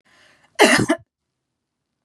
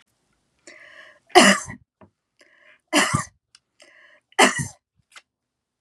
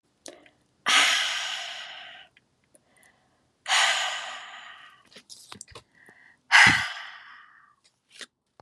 {"cough_length": "2.0 s", "cough_amplitude": 32755, "cough_signal_mean_std_ratio": 0.31, "three_cough_length": "5.8 s", "three_cough_amplitude": 32767, "three_cough_signal_mean_std_ratio": 0.27, "exhalation_length": "8.6 s", "exhalation_amplitude": 26385, "exhalation_signal_mean_std_ratio": 0.35, "survey_phase": "beta (2021-08-13 to 2022-03-07)", "age": "45-64", "gender": "Female", "wearing_mask": "No", "symptom_none": true, "smoker_status": "Ex-smoker", "respiratory_condition_asthma": false, "respiratory_condition_other": false, "recruitment_source": "REACT", "submission_delay": "2 days", "covid_test_result": "Negative", "covid_test_method": "RT-qPCR", "influenza_a_test_result": "Unknown/Void", "influenza_b_test_result": "Unknown/Void"}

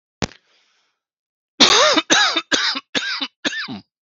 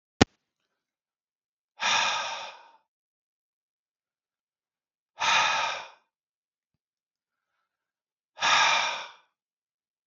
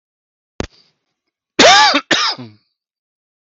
{"three_cough_length": "4.0 s", "three_cough_amplitude": 32767, "three_cough_signal_mean_std_ratio": 0.47, "exhalation_length": "10.1 s", "exhalation_amplitude": 32766, "exhalation_signal_mean_std_ratio": 0.32, "cough_length": "3.4 s", "cough_amplitude": 32768, "cough_signal_mean_std_ratio": 0.36, "survey_phase": "beta (2021-08-13 to 2022-03-07)", "age": "45-64", "gender": "Male", "wearing_mask": "No", "symptom_runny_or_blocked_nose": true, "symptom_fatigue": true, "symptom_change_to_sense_of_smell_or_taste": true, "symptom_onset": "12 days", "smoker_status": "Never smoked", "respiratory_condition_asthma": false, "respiratory_condition_other": false, "recruitment_source": "REACT", "submission_delay": "1 day", "covid_test_result": "Negative", "covid_test_method": "RT-qPCR", "influenza_a_test_result": "Negative", "influenza_b_test_result": "Negative"}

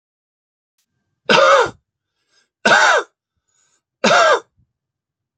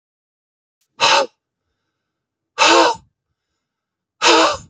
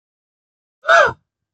{"three_cough_length": "5.4 s", "three_cough_amplitude": 31784, "three_cough_signal_mean_std_ratio": 0.38, "exhalation_length": "4.7 s", "exhalation_amplitude": 32768, "exhalation_signal_mean_std_ratio": 0.37, "cough_length": "1.5 s", "cough_amplitude": 29157, "cough_signal_mean_std_ratio": 0.31, "survey_phase": "beta (2021-08-13 to 2022-03-07)", "age": "45-64", "gender": "Male", "wearing_mask": "No", "symptom_none": true, "smoker_status": "Never smoked", "respiratory_condition_asthma": false, "respiratory_condition_other": false, "recruitment_source": "REACT", "submission_delay": "1 day", "covid_test_result": "Negative", "covid_test_method": "RT-qPCR", "influenza_a_test_result": "Negative", "influenza_b_test_result": "Negative"}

